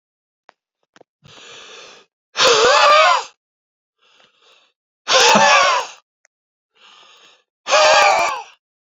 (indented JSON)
{
  "exhalation_length": "9.0 s",
  "exhalation_amplitude": 30972,
  "exhalation_signal_mean_std_ratio": 0.44,
  "survey_phase": "beta (2021-08-13 to 2022-03-07)",
  "age": "65+",
  "gender": "Male",
  "wearing_mask": "No",
  "symptom_none": true,
  "smoker_status": "Never smoked",
  "respiratory_condition_asthma": false,
  "respiratory_condition_other": false,
  "recruitment_source": "REACT",
  "submission_delay": "2 days",
  "covid_test_result": "Negative",
  "covid_test_method": "RT-qPCR"
}